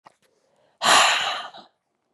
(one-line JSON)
{"exhalation_length": "2.1 s", "exhalation_amplitude": 23431, "exhalation_signal_mean_std_ratio": 0.42, "survey_phase": "beta (2021-08-13 to 2022-03-07)", "age": "18-44", "gender": "Female", "wearing_mask": "No", "symptom_cough_any": true, "symptom_runny_or_blocked_nose": true, "symptom_fatigue": true, "symptom_headache": true, "symptom_onset": "6 days", "smoker_status": "Never smoked", "respiratory_condition_asthma": false, "respiratory_condition_other": false, "recruitment_source": "Test and Trace", "submission_delay": "2 days", "covid_test_result": "Positive", "covid_test_method": "RT-qPCR", "covid_ct_value": 25.5, "covid_ct_gene": "ORF1ab gene"}